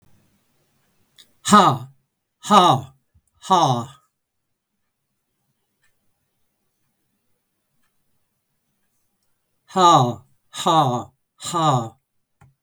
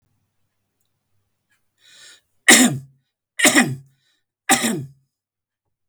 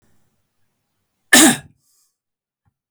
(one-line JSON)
{"exhalation_length": "12.6 s", "exhalation_amplitude": 32766, "exhalation_signal_mean_std_ratio": 0.32, "three_cough_length": "5.9 s", "three_cough_amplitude": 32768, "three_cough_signal_mean_std_ratio": 0.29, "cough_length": "2.9 s", "cough_amplitude": 32767, "cough_signal_mean_std_ratio": 0.23, "survey_phase": "beta (2021-08-13 to 2022-03-07)", "age": "65+", "gender": "Male", "wearing_mask": "No", "symptom_diarrhoea": true, "symptom_fatigue": true, "smoker_status": "Ex-smoker", "respiratory_condition_asthma": false, "respiratory_condition_other": false, "recruitment_source": "REACT", "submission_delay": "2 days", "covid_test_result": "Negative", "covid_test_method": "RT-qPCR", "influenza_a_test_result": "Negative", "influenza_b_test_result": "Negative"}